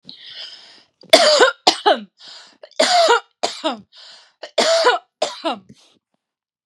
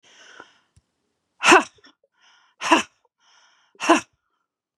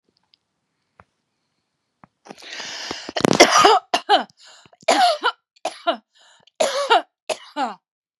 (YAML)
three_cough_length: 6.7 s
three_cough_amplitude: 32768
three_cough_signal_mean_std_ratio: 0.43
exhalation_length: 4.8 s
exhalation_amplitude: 32642
exhalation_signal_mean_std_ratio: 0.25
cough_length: 8.2 s
cough_amplitude: 32768
cough_signal_mean_std_ratio: 0.36
survey_phase: beta (2021-08-13 to 2022-03-07)
age: 45-64
gender: Female
wearing_mask: 'No'
symptom_none: true
smoker_status: Ex-smoker
respiratory_condition_asthma: false
respiratory_condition_other: false
recruitment_source: REACT
submission_delay: 0 days
covid_test_result: Negative
covid_test_method: RT-qPCR